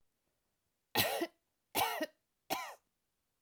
{"three_cough_length": "3.4 s", "three_cough_amplitude": 4807, "three_cough_signal_mean_std_ratio": 0.38, "survey_phase": "alpha (2021-03-01 to 2021-08-12)", "age": "45-64", "gender": "Female", "wearing_mask": "No", "symptom_none": true, "smoker_status": "Current smoker (1 to 10 cigarettes per day)", "respiratory_condition_asthma": false, "respiratory_condition_other": false, "recruitment_source": "REACT", "submission_delay": "2 days", "covid_test_result": "Negative", "covid_test_method": "RT-qPCR"}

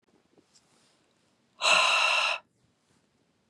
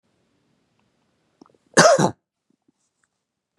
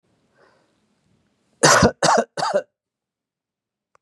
{"exhalation_length": "3.5 s", "exhalation_amplitude": 11031, "exhalation_signal_mean_std_ratio": 0.39, "cough_length": "3.6 s", "cough_amplitude": 32673, "cough_signal_mean_std_ratio": 0.24, "three_cough_length": "4.0 s", "three_cough_amplitude": 31126, "three_cough_signal_mean_std_ratio": 0.32, "survey_phase": "beta (2021-08-13 to 2022-03-07)", "age": "45-64", "gender": "Male", "wearing_mask": "No", "symptom_none": true, "smoker_status": "Never smoked", "respiratory_condition_asthma": false, "respiratory_condition_other": false, "recruitment_source": "REACT", "submission_delay": "6 days", "covid_test_result": "Negative", "covid_test_method": "RT-qPCR", "influenza_a_test_result": "Negative", "influenza_b_test_result": "Negative"}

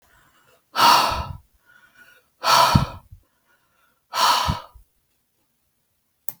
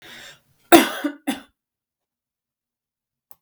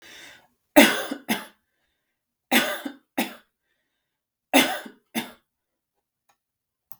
{"exhalation_length": "6.4 s", "exhalation_amplitude": 32672, "exhalation_signal_mean_std_ratio": 0.37, "cough_length": "3.4 s", "cough_amplitude": 32768, "cough_signal_mean_std_ratio": 0.21, "three_cough_length": "7.0 s", "three_cough_amplitude": 32768, "three_cough_signal_mean_std_ratio": 0.27, "survey_phase": "beta (2021-08-13 to 2022-03-07)", "age": "45-64", "gender": "Female", "wearing_mask": "No", "symptom_headache": true, "smoker_status": "Never smoked", "respiratory_condition_asthma": false, "respiratory_condition_other": false, "recruitment_source": "REACT", "submission_delay": "1 day", "covid_test_result": "Negative", "covid_test_method": "RT-qPCR"}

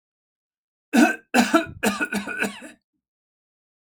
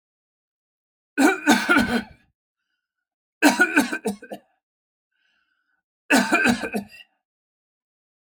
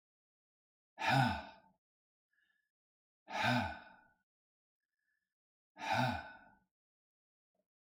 {"cough_length": "3.8 s", "cough_amplitude": 22204, "cough_signal_mean_std_ratio": 0.39, "three_cough_length": "8.4 s", "three_cough_amplitude": 26550, "three_cough_signal_mean_std_ratio": 0.37, "exhalation_length": "7.9 s", "exhalation_amplitude": 3952, "exhalation_signal_mean_std_ratio": 0.32, "survey_phase": "alpha (2021-03-01 to 2021-08-12)", "age": "45-64", "gender": "Male", "wearing_mask": "No", "symptom_fatigue": true, "symptom_headache": true, "symptom_onset": "12 days", "smoker_status": "Ex-smoker", "respiratory_condition_asthma": false, "respiratory_condition_other": false, "recruitment_source": "REACT", "submission_delay": "3 days", "covid_test_result": "Negative", "covid_test_method": "RT-qPCR"}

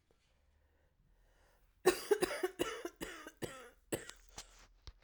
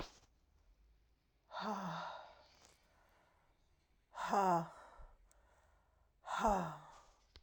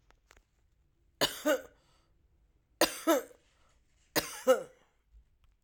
{"cough_length": "5.0 s", "cough_amplitude": 5555, "cough_signal_mean_std_ratio": 0.32, "exhalation_length": "7.4 s", "exhalation_amplitude": 3052, "exhalation_signal_mean_std_ratio": 0.38, "three_cough_length": "5.6 s", "three_cough_amplitude": 8967, "three_cough_signal_mean_std_ratio": 0.3, "survey_phase": "alpha (2021-03-01 to 2021-08-12)", "age": "45-64", "gender": "Male", "wearing_mask": "No", "symptom_cough_any": true, "symptom_diarrhoea": true, "symptom_fatigue": true, "symptom_headache": true, "symptom_onset": "10 days", "smoker_status": "Ex-smoker", "respiratory_condition_asthma": false, "respiratory_condition_other": false, "recruitment_source": "Test and Trace", "submission_delay": "8 days", "covid_test_result": "Positive", "covid_test_method": "RT-qPCR", "covid_ct_value": 23.3, "covid_ct_gene": "ORF1ab gene"}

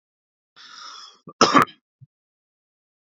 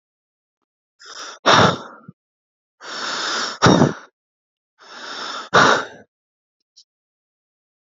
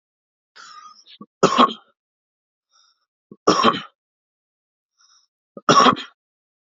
{"cough_length": "3.2 s", "cough_amplitude": 27488, "cough_signal_mean_std_ratio": 0.22, "exhalation_length": "7.9 s", "exhalation_amplitude": 30614, "exhalation_signal_mean_std_ratio": 0.34, "three_cough_length": "6.7 s", "three_cough_amplitude": 32767, "three_cough_signal_mean_std_ratio": 0.27, "survey_phase": "beta (2021-08-13 to 2022-03-07)", "age": "18-44", "gender": "Male", "wearing_mask": "No", "symptom_none": true, "smoker_status": "Ex-smoker", "respiratory_condition_asthma": false, "respiratory_condition_other": false, "recruitment_source": "REACT", "submission_delay": "2 days", "covid_test_result": "Negative", "covid_test_method": "RT-qPCR"}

